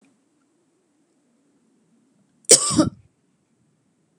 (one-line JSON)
{"cough_length": "4.2 s", "cough_amplitude": 32768, "cough_signal_mean_std_ratio": 0.2, "survey_phase": "beta (2021-08-13 to 2022-03-07)", "age": "45-64", "gender": "Female", "wearing_mask": "No", "symptom_none": true, "smoker_status": "Never smoked", "respiratory_condition_asthma": false, "respiratory_condition_other": false, "recruitment_source": "REACT", "submission_delay": "3 days", "covid_test_result": "Negative", "covid_test_method": "RT-qPCR"}